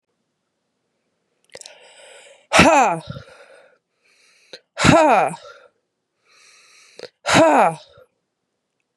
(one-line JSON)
{"exhalation_length": "9.0 s", "exhalation_amplitude": 32768, "exhalation_signal_mean_std_ratio": 0.34, "survey_phase": "beta (2021-08-13 to 2022-03-07)", "age": "18-44", "gender": "Female", "wearing_mask": "No", "symptom_cough_any": true, "symptom_runny_or_blocked_nose": true, "symptom_shortness_of_breath": true, "symptom_fatigue": true, "symptom_headache": true, "symptom_change_to_sense_of_smell_or_taste": true, "symptom_loss_of_taste": true, "symptom_onset": "3 days", "smoker_status": "Never smoked", "respiratory_condition_asthma": true, "respiratory_condition_other": false, "recruitment_source": "Test and Trace", "submission_delay": "1 day", "covid_test_result": "Positive", "covid_test_method": "ePCR"}